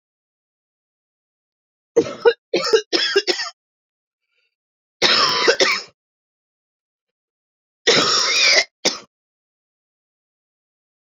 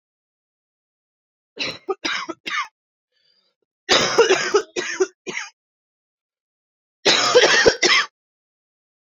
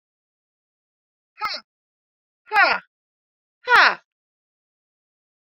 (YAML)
three_cough_length: 11.2 s
three_cough_amplitude: 27303
three_cough_signal_mean_std_ratio: 0.37
cough_length: 9.0 s
cough_amplitude: 27712
cough_signal_mean_std_ratio: 0.4
exhalation_length: 5.5 s
exhalation_amplitude: 27334
exhalation_signal_mean_std_ratio: 0.24
survey_phase: beta (2021-08-13 to 2022-03-07)
age: 18-44
gender: Female
wearing_mask: 'No'
symptom_cough_any: true
symptom_shortness_of_breath: true
symptom_headache: true
symptom_onset: 12 days
smoker_status: Current smoker (1 to 10 cigarettes per day)
respiratory_condition_asthma: false
respiratory_condition_other: false
recruitment_source: REACT
submission_delay: 2 days
covid_test_result: Negative
covid_test_method: RT-qPCR